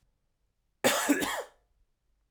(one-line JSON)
{"cough_length": "2.3 s", "cough_amplitude": 9911, "cough_signal_mean_std_ratio": 0.38, "survey_phase": "alpha (2021-03-01 to 2021-08-12)", "age": "18-44", "gender": "Male", "wearing_mask": "No", "symptom_cough_any": true, "symptom_new_continuous_cough": true, "symptom_shortness_of_breath": true, "symptom_abdominal_pain": true, "symptom_diarrhoea": true, "symptom_fatigue": true, "symptom_onset": "3 days", "smoker_status": "Ex-smoker", "respiratory_condition_asthma": false, "respiratory_condition_other": false, "recruitment_source": "Test and Trace", "submission_delay": "2 days", "covid_test_result": "Positive", "covid_test_method": "RT-qPCR", "covid_ct_value": 21.9, "covid_ct_gene": "ORF1ab gene", "covid_ct_mean": 22.5, "covid_viral_load": "43000 copies/ml", "covid_viral_load_category": "Low viral load (10K-1M copies/ml)"}